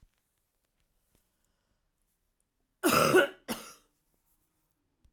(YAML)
cough_length: 5.1 s
cough_amplitude: 11993
cough_signal_mean_std_ratio: 0.25
survey_phase: alpha (2021-03-01 to 2021-08-12)
age: 45-64
gender: Female
wearing_mask: 'No'
symptom_headache: true
symptom_change_to_sense_of_smell_or_taste: true
symptom_onset: 5 days
smoker_status: Never smoked
respiratory_condition_asthma: false
respiratory_condition_other: false
recruitment_source: Test and Trace
submission_delay: 2 days
covid_test_result: Positive
covid_test_method: RT-qPCR
covid_ct_value: 15.6
covid_ct_gene: ORF1ab gene
covid_ct_mean: 16.1
covid_viral_load: 5000000 copies/ml
covid_viral_load_category: High viral load (>1M copies/ml)